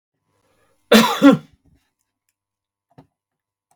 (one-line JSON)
{"cough_length": "3.8 s", "cough_amplitude": 32768, "cough_signal_mean_std_ratio": 0.25, "survey_phase": "beta (2021-08-13 to 2022-03-07)", "age": "65+", "gender": "Male", "wearing_mask": "No", "symptom_none": true, "smoker_status": "Ex-smoker", "respiratory_condition_asthma": false, "respiratory_condition_other": false, "recruitment_source": "REACT", "submission_delay": "2 days", "covid_test_result": "Negative", "covid_test_method": "RT-qPCR", "influenza_a_test_result": "Negative", "influenza_b_test_result": "Negative"}